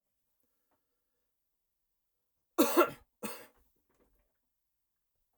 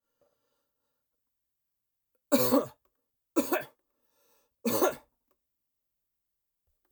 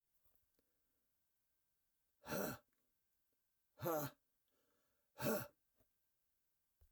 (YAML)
cough_length: 5.4 s
cough_amplitude: 8713
cough_signal_mean_std_ratio: 0.2
three_cough_length: 6.9 s
three_cough_amplitude: 11485
three_cough_signal_mean_std_ratio: 0.27
exhalation_length: 6.9 s
exhalation_amplitude: 1503
exhalation_signal_mean_std_ratio: 0.29
survey_phase: alpha (2021-03-01 to 2021-08-12)
age: 65+
gender: Male
wearing_mask: 'No'
symptom_none: true
smoker_status: Never smoked
respiratory_condition_asthma: false
respiratory_condition_other: false
recruitment_source: REACT
submission_delay: 2 days
covid_test_result: Negative
covid_test_method: RT-qPCR